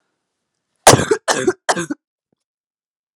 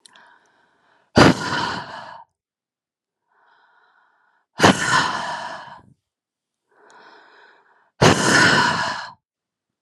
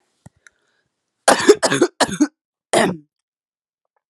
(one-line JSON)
{"three_cough_length": "3.2 s", "three_cough_amplitude": 32768, "three_cough_signal_mean_std_ratio": 0.3, "exhalation_length": "9.8 s", "exhalation_amplitude": 32768, "exhalation_signal_mean_std_ratio": 0.36, "cough_length": "4.1 s", "cough_amplitude": 32768, "cough_signal_mean_std_ratio": 0.33, "survey_phase": "alpha (2021-03-01 to 2021-08-12)", "age": "18-44", "gender": "Female", "wearing_mask": "No", "symptom_cough_any": true, "symptom_shortness_of_breath": true, "symptom_fatigue": true, "symptom_fever_high_temperature": true, "symptom_headache": true, "symptom_change_to_sense_of_smell_or_taste": true, "symptom_onset": "2 days", "smoker_status": "Never smoked", "respiratory_condition_asthma": false, "respiratory_condition_other": false, "recruitment_source": "Test and Trace", "submission_delay": "1 day", "covid_test_result": "Positive", "covid_test_method": "RT-qPCR", "covid_ct_value": 15.3, "covid_ct_gene": "ORF1ab gene", "covid_ct_mean": 15.8, "covid_viral_load": "6400000 copies/ml", "covid_viral_load_category": "High viral load (>1M copies/ml)"}